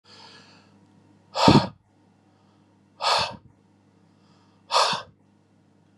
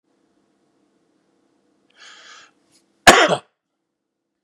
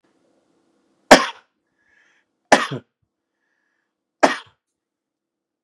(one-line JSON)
{"exhalation_length": "6.0 s", "exhalation_amplitude": 31505, "exhalation_signal_mean_std_ratio": 0.29, "cough_length": "4.4 s", "cough_amplitude": 32768, "cough_signal_mean_std_ratio": 0.19, "three_cough_length": "5.6 s", "three_cough_amplitude": 32768, "three_cough_signal_mean_std_ratio": 0.18, "survey_phase": "beta (2021-08-13 to 2022-03-07)", "age": "45-64", "gender": "Male", "wearing_mask": "No", "symptom_none": true, "smoker_status": "Ex-smoker", "respiratory_condition_asthma": false, "respiratory_condition_other": false, "recruitment_source": "REACT", "submission_delay": "1 day", "covid_test_result": "Negative", "covid_test_method": "RT-qPCR", "influenza_a_test_result": "Negative", "influenza_b_test_result": "Negative"}